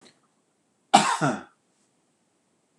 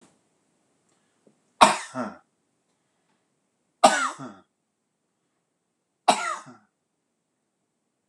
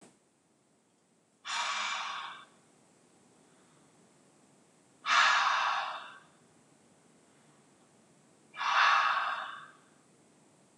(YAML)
cough_length: 2.8 s
cough_amplitude: 25751
cough_signal_mean_std_ratio: 0.26
three_cough_length: 8.1 s
three_cough_amplitude: 26028
three_cough_signal_mean_std_ratio: 0.21
exhalation_length: 10.8 s
exhalation_amplitude: 7730
exhalation_signal_mean_std_ratio: 0.4
survey_phase: beta (2021-08-13 to 2022-03-07)
age: 45-64
gender: Male
wearing_mask: 'No'
symptom_none: true
smoker_status: Never smoked
respiratory_condition_asthma: true
respiratory_condition_other: false
recruitment_source: REACT
submission_delay: 1 day
covid_test_result: Negative
covid_test_method: RT-qPCR
influenza_a_test_result: Negative
influenza_b_test_result: Negative